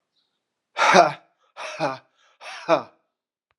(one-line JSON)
{"exhalation_length": "3.6 s", "exhalation_amplitude": 32286, "exhalation_signal_mean_std_ratio": 0.32, "survey_phase": "alpha (2021-03-01 to 2021-08-12)", "age": "45-64", "gender": "Male", "wearing_mask": "No", "symptom_cough_any": true, "symptom_fatigue": true, "symptom_headache": true, "smoker_status": "Never smoked", "respiratory_condition_asthma": false, "respiratory_condition_other": false, "recruitment_source": "Test and Trace", "submission_delay": "1 day", "covid_test_result": "Positive", "covid_test_method": "RT-qPCR", "covid_ct_value": 29.5, "covid_ct_gene": "ORF1ab gene"}